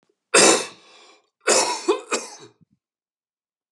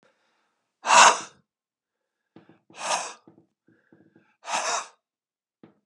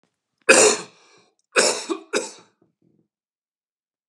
cough_length: 3.7 s
cough_amplitude: 26942
cough_signal_mean_std_ratio: 0.37
exhalation_length: 5.9 s
exhalation_amplitude: 25939
exhalation_signal_mean_std_ratio: 0.25
three_cough_length: 4.1 s
three_cough_amplitude: 31867
three_cough_signal_mean_std_ratio: 0.31
survey_phase: alpha (2021-03-01 to 2021-08-12)
age: 65+
gender: Male
wearing_mask: 'No'
symptom_cough_any: true
smoker_status: Ex-smoker
respiratory_condition_asthma: false
respiratory_condition_other: false
recruitment_source: REACT
submission_delay: 1 day
covid_test_result: Negative
covid_test_method: RT-qPCR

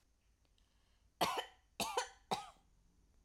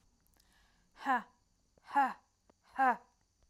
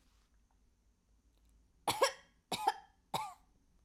cough_length: 3.2 s
cough_amplitude: 2778
cough_signal_mean_std_ratio: 0.35
exhalation_length: 3.5 s
exhalation_amplitude: 4260
exhalation_signal_mean_std_ratio: 0.32
three_cough_length: 3.8 s
three_cough_amplitude: 4601
three_cough_signal_mean_std_ratio: 0.29
survey_phase: alpha (2021-03-01 to 2021-08-12)
age: 18-44
gender: Female
wearing_mask: 'No'
symptom_none: true
smoker_status: Never smoked
respiratory_condition_asthma: true
respiratory_condition_other: false
recruitment_source: REACT
submission_delay: 1 day
covid_test_result: Negative
covid_test_method: RT-qPCR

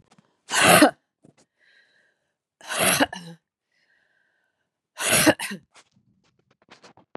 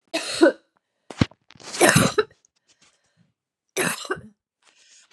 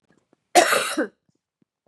exhalation_length: 7.2 s
exhalation_amplitude: 28723
exhalation_signal_mean_std_ratio: 0.31
three_cough_length: 5.1 s
three_cough_amplitude: 32544
three_cough_signal_mean_std_ratio: 0.33
cough_length: 1.9 s
cough_amplitude: 26939
cough_signal_mean_std_ratio: 0.36
survey_phase: beta (2021-08-13 to 2022-03-07)
age: 45-64
gender: Female
wearing_mask: 'No'
symptom_cough_any: true
symptom_runny_or_blocked_nose: true
symptom_sore_throat: true
symptom_fatigue: true
symptom_onset: 3 days
smoker_status: Ex-smoker
respiratory_condition_asthma: false
respiratory_condition_other: false
recruitment_source: Test and Trace
submission_delay: 1 day
covid_test_result: Positive
covid_test_method: RT-qPCR
covid_ct_value: 21.5
covid_ct_gene: ORF1ab gene
covid_ct_mean: 22.4
covid_viral_load: 46000 copies/ml
covid_viral_load_category: Low viral load (10K-1M copies/ml)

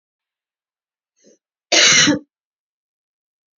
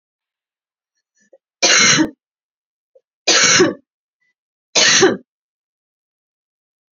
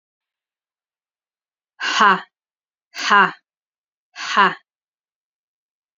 cough_length: 3.6 s
cough_amplitude: 32768
cough_signal_mean_std_ratio: 0.29
three_cough_length: 6.9 s
three_cough_amplitude: 32768
three_cough_signal_mean_std_ratio: 0.36
exhalation_length: 6.0 s
exhalation_amplitude: 29440
exhalation_signal_mean_std_ratio: 0.28
survey_phase: beta (2021-08-13 to 2022-03-07)
age: 18-44
gender: Female
wearing_mask: 'No'
symptom_new_continuous_cough: true
symptom_runny_or_blocked_nose: true
symptom_shortness_of_breath: true
symptom_sore_throat: true
symptom_headache: true
symptom_onset: 7 days
smoker_status: Never smoked
respiratory_condition_asthma: false
respiratory_condition_other: false
recruitment_source: Test and Trace
submission_delay: 2 days
covid_test_result: Positive
covid_test_method: ePCR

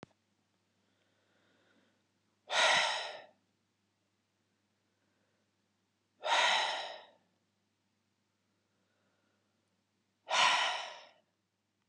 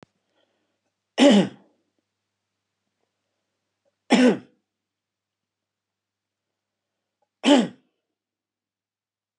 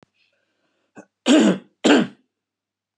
exhalation_length: 11.9 s
exhalation_amplitude: 6368
exhalation_signal_mean_std_ratio: 0.31
three_cough_length: 9.4 s
three_cough_amplitude: 22474
three_cough_signal_mean_std_ratio: 0.23
cough_length: 3.0 s
cough_amplitude: 26590
cough_signal_mean_std_ratio: 0.35
survey_phase: beta (2021-08-13 to 2022-03-07)
age: 65+
gender: Male
wearing_mask: 'No'
symptom_none: true
smoker_status: Never smoked
respiratory_condition_asthma: false
respiratory_condition_other: false
recruitment_source: REACT
submission_delay: 1 day
covid_test_result: Negative
covid_test_method: RT-qPCR
influenza_a_test_result: Unknown/Void
influenza_b_test_result: Unknown/Void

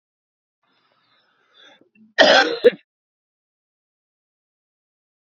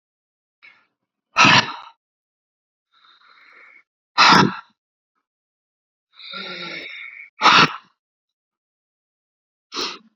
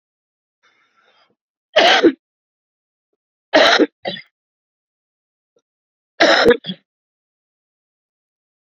cough_length: 5.2 s
cough_amplitude: 31751
cough_signal_mean_std_ratio: 0.22
exhalation_length: 10.2 s
exhalation_amplitude: 31432
exhalation_signal_mean_std_ratio: 0.27
three_cough_length: 8.6 s
three_cough_amplitude: 31116
three_cough_signal_mean_std_ratio: 0.29
survey_phase: beta (2021-08-13 to 2022-03-07)
age: 45-64
gender: Male
wearing_mask: 'No'
symptom_cough_any: true
symptom_new_continuous_cough: true
symptom_runny_or_blocked_nose: true
symptom_headache: true
symptom_other: true
symptom_onset: 4 days
smoker_status: Ex-smoker
respiratory_condition_asthma: false
respiratory_condition_other: false
recruitment_source: Test and Trace
submission_delay: 2 days
covid_test_result: Positive
covid_test_method: RT-qPCR
covid_ct_value: 37.5
covid_ct_gene: N gene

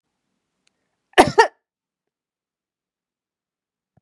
cough_length: 4.0 s
cough_amplitude: 32768
cough_signal_mean_std_ratio: 0.16
survey_phase: beta (2021-08-13 to 2022-03-07)
age: 45-64
gender: Female
wearing_mask: 'No'
symptom_none: true
smoker_status: Never smoked
respiratory_condition_asthma: false
respiratory_condition_other: false
recruitment_source: REACT
submission_delay: 5 days
covid_test_result: Negative
covid_test_method: RT-qPCR
influenza_a_test_result: Negative
influenza_b_test_result: Negative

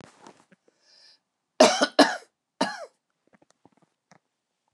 cough_length: 4.7 s
cough_amplitude: 27436
cough_signal_mean_std_ratio: 0.23
survey_phase: beta (2021-08-13 to 2022-03-07)
age: 45-64
gender: Female
wearing_mask: 'No'
symptom_none: true
smoker_status: Ex-smoker
respiratory_condition_asthma: false
respiratory_condition_other: false
recruitment_source: REACT
submission_delay: 2 days
covid_test_result: Negative
covid_test_method: RT-qPCR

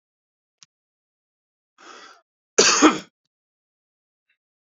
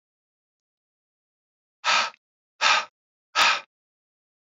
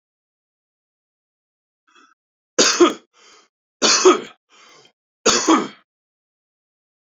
cough_length: 4.8 s
cough_amplitude: 27934
cough_signal_mean_std_ratio: 0.21
exhalation_length: 4.4 s
exhalation_amplitude: 16597
exhalation_signal_mean_std_ratio: 0.31
three_cough_length: 7.2 s
three_cough_amplitude: 32767
three_cough_signal_mean_std_ratio: 0.3
survey_phase: beta (2021-08-13 to 2022-03-07)
age: 18-44
gender: Male
wearing_mask: 'No'
symptom_change_to_sense_of_smell_or_taste: true
smoker_status: Never smoked
respiratory_condition_asthma: false
respiratory_condition_other: false
recruitment_source: Test and Trace
submission_delay: 2 days
covid_test_result: Positive
covid_test_method: ePCR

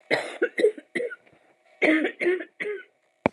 cough_length: 3.3 s
cough_amplitude: 25242
cough_signal_mean_std_ratio: 0.49
survey_phase: alpha (2021-03-01 to 2021-08-12)
age: 18-44
gender: Female
wearing_mask: 'No'
symptom_cough_any: true
symptom_abdominal_pain: true
symptom_fatigue: true
symptom_fever_high_temperature: true
symptom_headache: true
symptom_onset: 4 days
smoker_status: Ex-smoker
respiratory_condition_asthma: false
respiratory_condition_other: false
recruitment_source: Test and Trace
submission_delay: 2 days
covid_test_result: Positive
covid_test_method: RT-qPCR
covid_ct_value: 22.1
covid_ct_gene: ORF1ab gene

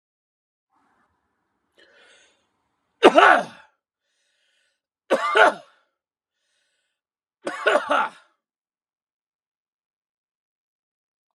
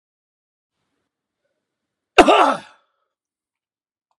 three_cough_length: 11.3 s
three_cough_amplitude: 32767
three_cough_signal_mean_std_ratio: 0.23
cough_length: 4.2 s
cough_amplitude: 32768
cough_signal_mean_std_ratio: 0.22
survey_phase: beta (2021-08-13 to 2022-03-07)
age: 45-64
gender: Male
wearing_mask: 'No'
symptom_none: true
smoker_status: Never smoked
respiratory_condition_asthma: false
respiratory_condition_other: false
recruitment_source: REACT
submission_delay: 1 day
covid_test_result: Negative
covid_test_method: RT-qPCR
influenza_a_test_result: Negative
influenza_b_test_result: Negative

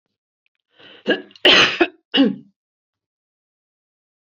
cough_length: 4.3 s
cough_amplitude: 32768
cough_signal_mean_std_ratio: 0.31
survey_phase: beta (2021-08-13 to 2022-03-07)
age: 65+
gender: Female
wearing_mask: 'No'
symptom_none: true
smoker_status: Ex-smoker
respiratory_condition_asthma: false
respiratory_condition_other: false
recruitment_source: REACT
submission_delay: 0 days
covid_test_result: Negative
covid_test_method: RT-qPCR
influenza_a_test_result: Negative
influenza_b_test_result: Negative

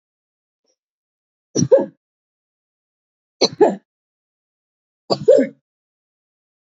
three_cough_length: 6.7 s
three_cough_amplitude: 27799
three_cough_signal_mean_std_ratio: 0.25
survey_phase: beta (2021-08-13 to 2022-03-07)
age: 65+
gender: Female
wearing_mask: 'No'
symptom_runny_or_blocked_nose: true
symptom_sore_throat: true
symptom_fatigue: true
symptom_other: true
smoker_status: Never smoked
respiratory_condition_asthma: true
respiratory_condition_other: false
recruitment_source: Test and Trace
submission_delay: 2 days
covid_test_result: Positive
covid_test_method: ePCR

